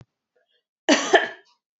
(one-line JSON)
{"cough_length": "1.8 s", "cough_amplitude": 26810, "cough_signal_mean_std_ratio": 0.31, "survey_phase": "beta (2021-08-13 to 2022-03-07)", "age": "18-44", "gender": "Female", "wearing_mask": "No", "symptom_none": true, "smoker_status": "Never smoked", "respiratory_condition_asthma": false, "respiratory_condition_other": false, "recruitment_source": "REACT", "submission_delay": "1 day", "covid_test_result": "Negative", "covid_test_method": "RT-qPCR", "influenza_a_test_result": "Negative", "influenza_b_test_result": "Negative"}